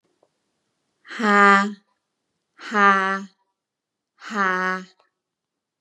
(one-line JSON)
{"exhalation_length": "5.8 s", "exhalation_amplitude": 28953, "exhalation_signal_mean_std_ratio": 0.35, "survey_phase": "beta (2021-08-13 to 2022-03-07)", "age": "18-44", "gender": "Female", "wearing_mask": "No", "symptom_none": true, "smoker_status": "Never smoked", "respiratory_condition_asthma": false, "respiratory_condition_other": false, "recruitment_source": "REACT", "submission_delay": "2 days", "covid_test_result": "Negative", "covid_test_method": "RT-qPCR", "influenza_a_test_result": "Negative", "influenza_b_test_result": "Negative"}